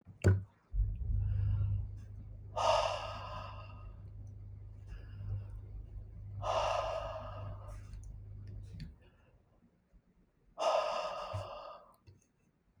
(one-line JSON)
{"exhalation_length": "12.8 s", "exhalation_amplitude": 4818, "exhalation_signal_mean_std_ratio": 0.61, "survey_phase": "beta (2021-08-13 to 2022-03-07)", "age": "65+", "gender": "Female", "wearing_mask": "No", "symptom_none": true, "smoker_status": "Never smoked", "respiratory_condition_asthma": false, "respiratory_condition_other": false, "recruitment_source": "REACT", "submission_delay": "1 day", "covid_test_result": "Negative", "covid_test_method": "RT-qPCR"}